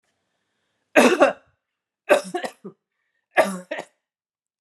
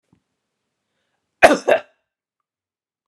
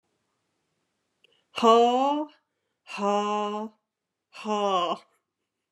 {
  "three_cough_length": "4.6 s",
  "three_cough_amplitude": 31591,
  "three_cough_signal_mean_std_ratio": 0.3,
  "cough_length": "3.1 s",
  "cough_amplitude": 32768,
  "cough_signal_mean_std_ratio": 0.21,
  "exhalation_length": "5.7 s",
  "exhalation_amplitude": 19711,
  "exhalation_signal_mean_std_ratio": 0.42,
  "survey_phase": "beta (2021-08-13 to 2022-03-07)",
  "age": "45-64",
  "gender": "Female",
  "wearing_mask": "No",
  "symptom_none": true,
  "smoker_status": "Never smoked",
  "respiratory_condition_asthma": false,
  "respiratory_condition_other": false,
  "recruitment_source": "REACT",
  "submission_delay": "2 days",
  "covid_test_result": "Negative",
  "covid_test_method": "RT-qPCR"
}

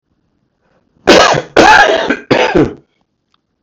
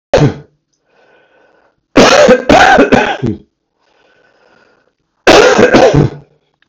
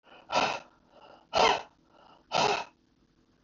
{
  "cough_length": "3.6 s",
  "cough_amplitude": 32768,
  "cough_signal_mean_std_ratio": 0.5,
  "three_cough_length": "6.7 s",
  "three_cough_amplitude": 32768,
  "three_cough_signal_mean_std_ratio": 0.5,
  "exhalation_length": "3.4 s",
  "exhalation_amplitude": 9920,
  "exhalation_signal_mean_std_ratio": 0.39,
  "survey_phase": "beta (2021-08-13 to 2022-03-07)",
  "age": "65+",
  "gender": "Male",
  "wearing_mask": "No",
  "symptom_cough_any": true,
  "symptom_runny_or_blocked_nose": true,
  "symptom_sore_throat": true,
  "symptom_fatigue": true,
  "symptom_fever_high_temperature": true,
  "symptom_headache": true,
  "symptom_change_to_sense_of_smell_or_taste": true,
  "symptom_onset": "4 days",
  "smoker_status": "Never smoked",
  "respiratory_condition_asthma": false,
  "respiratory_condition_other": false,
  "recruitment_source": "Test and Trace",
  "submission_delay": "1 day",
  "covid_test_result": "Positive",
  "covid_test_method": "RT-qPCR",
  "covid_ct_value": 20.6,
  "covid_ct_gene": "ORF1ab gene"
}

